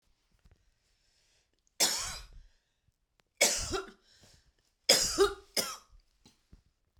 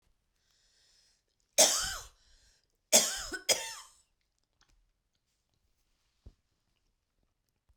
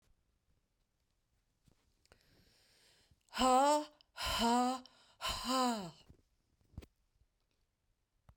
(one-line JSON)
{"three_cough_length": "7.0 s", "three_cough_amplitude": 14444, "three_cough_signal_mean_std_ratio": 0.32, "cough_length": "7.8 s", "cough_amplitude": 13058, "cough_signal_mean_std_ratio": 0.23, "exhalation_length": "8.4 s", "exhalation_amplitude": 4090, "exhalation_signal_mean_std_ratio": 0.37, "survey_phase": "beta (2021-08-13 to 2022-03-07)", "age": "65+", "gender": "Female", "wearing_mask": "No", "symptom_cough_any": true, "smoker_status": "Never smoked", "respiratory_condition_asthma": false, "respiratory_condition_other": false, "recruitment_source": "REACT", "submission_delay": "3 days", "covid_test_result": "Negative", "covid_test_method": "RT-qPCR"}